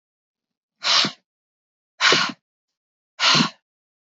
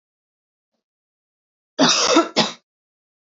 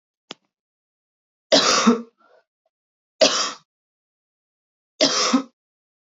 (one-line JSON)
{"exhalation_length": "4.1 s", "exhalation_amplitude": 24443, "exhalation_signal_mean_std_ratio": 0.36, "cough_length": "3.2 s", "cough_amplitude": 26694, "cough_signal_mean_std_ratio": 0.34, "three_cough_length": "6.1 s", "three_cough_amplitude": 27567, "three_cough_signal_mean_std_ratio": 0.33, "survey_phase": "beta (2021-08-13 to 2022-03-07)", "age": "18-44", "gender": "Female", "wearing_mask": "No", "symptom_cough_any": true, "symptom_fatigue": true, "symptom_headache": true, "symptom_other": true, "smoker_status": "Ex-smoker", "respiratory_condition_asthma": false, "respiratory_condition_other": false, "recruitment_source": "Test and Trace", "submission_delay": "2 days", "covid_test_result": "Positive", "covid_test_method": "LFT"}